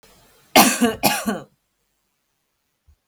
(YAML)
cough_length: 3.1 s
cough_amplitude: 32768
cough_signal_mean_std_ratio: 0.33
survey_phase: beta (2021-08-13 to 2022-03-07)
age: 18-44
gender: Female
wearing_mask: 'No'
symptom_none: true
smoker_status: Current smoker (1 to 10 cigarettes per day)
respiratory_condition_asthma: false
respiratory_condition_other: false
recruitment_source: REACT
submission_delay: 3 days
covid_test_result: Negative
covid_test_method: RT-qPCR
influenza_a_test_result: Negative
influenza_b_test_result: Negative